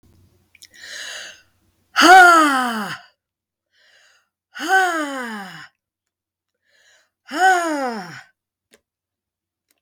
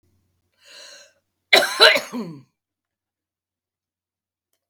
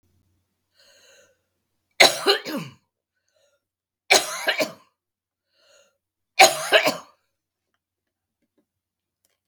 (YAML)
exhalation_length: 9.8 s
exhalation_amplitude: 32768
exhalation_signal_mean_std_ratio: 0.34
cough_length: 4.7 s
cough_amplitude: 32768
cough_signal_mean_std_ratio: 0.24
three_cough_length: 9.5 s
three_cough_amplitude: 32768
three_cough_signal_mean_std_ratio: 0.25
survey_phase: beta (2021-08-13 to 2022-03-07)
age: 65+
gender: Female
wearing_mask: 'No'
symptom_none: true
smoker_status: Ex-smoker
respiratory_condition_asthma: false
respiratory_condition_other: false
recruitment_source: REACT
submission_delay: 2 days
covid_test_result: Negative
covid_test_method: RT-qPCR
influenza_a_test_result: Negative
influenza_b_test_result: Negative